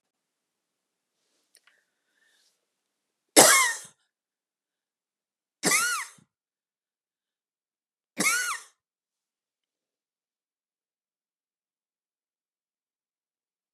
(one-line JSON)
{"three_cough_length": "13.7 s", "three_cough_amplitude": 32768, "three_cough_signal_mean_std_ratio": 0.2, "survey_phase": "beta (2021-08-13 to 2022-03-07)", "age": "45-64", "gender": "Female", "wearing_mask": "No", "symptom_cough_any": true, "symptom_new_continuous_cough": true, "symptom_runny_or_blocked_nose": true, "symptom_shortness_of_breath": true, "symptom_sore_throat": true, "symptom_abdominal_pain": true, "symptom_fatigue": true, "symptom_headache": true, "symptom_onset": "2 days", "smoker_status": "Never smoked", "respiratory_condition_asthma": false, "respiratory_condition_other": false, "recruitment_source": "Test and Trace", "submission_delay": "1 day", "covid_test_result": "Positive", "covid_test_method": "RT-qPCR", "covid_ct_value": 20.8, "covid_ct_gene": "ORF1ab gene"}